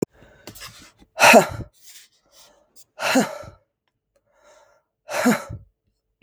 {"exhalation_length": "6.2 s", "exhalation_amplitude": 32768, "exhalation_signal_mean_std_ratio": 0.29, "survey_phase": "beta (2021-08-13 to 2022-03-07)", "age": "45-64", "gender": "Female", "wearing_mask": "No", "symptom_cough_any": true, "symptom_runny_or_blocked_nose": true, "symptom_shortness_of_breath": true, "symptom_sore_throat": true, "symptom_fatigue": true, "symptom_headache": true, "symptom_other": true, "symptom_onset": "3 days", "smoker_status": "Never smoked", "respiratory_condition_asthma": false, "respiratory_condition_other": false, "recruitment_source": "Test and Trace", "submission_delay": "2 days", "covid_test_result": "Positive", "covid_test_method": "ePCR"}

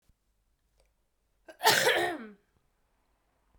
{"cough_length": "3.6 s", "cough_amplitude": 11985, "cough_signal_mean_std_ratio": 0.31, "survey_phase": "beta (2021-08-13 to 2022-03-07)", "age": "18-44", "gender": "Female", "wearing_mask": "No", "symptom_cough_any": true, "symptom_runny_or_blocked_nose": true, "symptom_fatigue": true, "smoker_status": "Never smoked", "respiratory_condition_asthma": false, "respiratory_condition_other": false, "recruitment_source": "Test and Trace", "submission_delay": "2 days", "covid_test_result": "Positive", "covid_test_method": "RT-qPCR", "covid_ct_value": 20.4, "covid_ct_gene": "ORF1ab gene"}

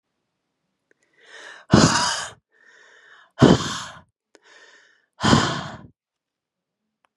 {"exhalation_length": "7.2 s", "exhalation_amplitude": 32337, "exhalation_signal_mean_std_ratio": 0.3, "survey_phase": "beta (2021-08-13 to 2022-03-07)", "age": "45-64", "gender": "Female", "wearing_mask": "No", "symptom_none": true, "smoker_status": "Never smoked", "respiratory_condition_asthma": false, "respiratory_condition_other": false, "recruitment_source": "REACT", "submission_delay": "1 day", "covid_test_result": "Negative", "covid_test_method": "RT-qPCR", "influenza_a_test_result": "Negative", "influenza_b_test_result": "Negative"}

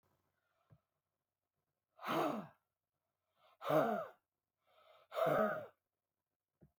{"exhalation_length": "6.8 s", "exhalation_amplitude": 2861, "exhalation_signal_mean_std_ratio": 0.35, "survey_phase": "beta (2021-08-13 to 2022-03-07)", "age": "65+", "gender": "Female", "wearing_mask": "No", "symptom_none": true, "symptom_onset": "8 days", "smoker_status": "Never smoked", "respiratory_condition_asthma": false, "respiratory_condition_other": false, "recruitment_source": "REACT", "submission_delay": "6 days", "covid_test_result": "Negative", "covid_test_method": "RT-qPCR"}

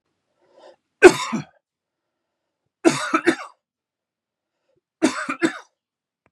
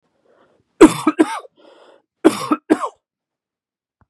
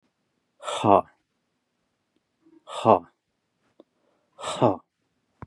{"three_cough_length": "6.3 s", "three_cough_amplitude": 32768, "three_cough_signal_mean_std_ratio": 0.24, "cough_length": "4.1 s", "cough_amplitude": 32768, "cough_signal_mean_std_ratio": 0.27, "exhalation_length": "5.5 s", "exhalation_amplitude": 25489, "exhalation_signal_mean_std_ratio": 0.24, "survey_phase": "beta (2021-08-13 to 2022-03-07)", "age": "45-64", "gender": "Male", "wearing_mask": "No", "symptom_none": true, "smoker_status": "Never smoked", "respiratory_condition_asthma": false, "respiratory_condition_other": false, "recruitment_source": "REACT", "submission_delay": "2 days", "covid_test_result": "Negative", "covid_test_method": "RT-qPCR", "influenza_a_test_result": "Negative", "influenza_b_test_result": "Negative"}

